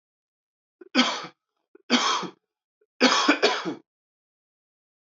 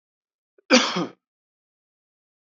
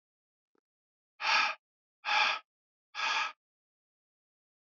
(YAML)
three_cough_length: 5.1 s
three_cough_amplitude: 21610
three_cough_signal_mean_std_ratio: 0.38
cough_length: 2.6 s
cough_amplitude: 24444
cough_signal_mean_std_ratio: 0.25
exhalation_length: 4.8 s
exhalation_amplitude: 5857
exhalation_signal_mean_std_ratio: 0.36
survey_phase: beta (2021-08-13 to 2022-03-07)
age: 18-44
gender: Male
wearing_mask: 'No'
symptom_cough_any: true
symptom_new_continuous_cough: true
symptom_runny_or_blocked_nose: true
symptom_fatigue: true
symptom_headache: true
symptom_onset: 2 days
smoker_status: Never smoked
respiratory_condition_asthma: false
respiratory_condition_other: false
recruitment_source: Test and Trace
submission_delay: 2 days
covid_test_result: Positive
covid_test_method: RT-qPCR
covid_ct_value: 19.4
covid_ct_gene: N gene
covid_ct_mean: 20.0
covid_viral_load: 270000 copies/ml
covid_viral_load_category: Low viral load (10K-1M copies/ml)